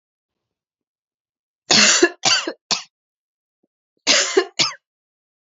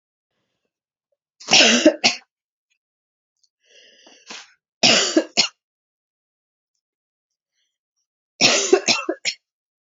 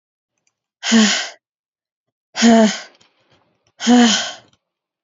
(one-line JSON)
{"cough_length": "5.5 s", "cough_amplitude": 32768, "cough_signal_mean_std_ratio": 0.35, "three_cough_length": "10.0 s", "three_cough_amplitude": 32768, "three_cough_signal_mean_std_ratio": 0.31, "exhalation_length": "5.0 s", "exhalation_amplitude": 32767, "exhalation_signal_mean_std_ratio": 0.41, "survey_phase": "alpha (2021-03-01 to 2021-08-12)", "age": "18-44", "gender": "Female", "wearing_mask": "No", "symptom_shortness_of_breath": true, "symptom_fatigue": true, "symptom_fever_high_temperature": true, "symptom_headache": true, "smoker_status": "Never smoked", "respiratory_condition_asthma": true, "respiratory_condition_other": false, "recruitment_source": "Test and Trace", "submission_delay": "2 days", "covid_test_result": "Positive", "covid_test_method": "RT-qPCR", "covid_ct_value": 18.4, "covid_ct_gene": "N gene", "covid_ct_mean": 18.5, "covid_viral_load": "820000 copies/ml", "covid_viral_load_category": "Low viral load (10K-1M copies/ml)"}